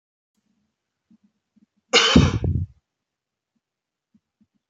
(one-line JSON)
{"cough_length": "4.7 s", "cough_amplitude": 27052, "cough_signal_mean_std_ratio": 0.27, "survey_phase": "beta (2021-08-13 to 2022-03-07)", "age": "18-44", "gender": "Male", "wearing_mask": "No", "symptom_none": true, "smoker_status": "Never smoked", "respiratory_condition_asthma": false, "respiratory_condition_other": false, "recruitment_source": "REACT", "submission_delay": "1 day", "covid_test_result": "Negative", "covid_test_method": "RT-qPCR", "influenza_a_test_result": "Negative", "influenza_b_test_result": "Negative"}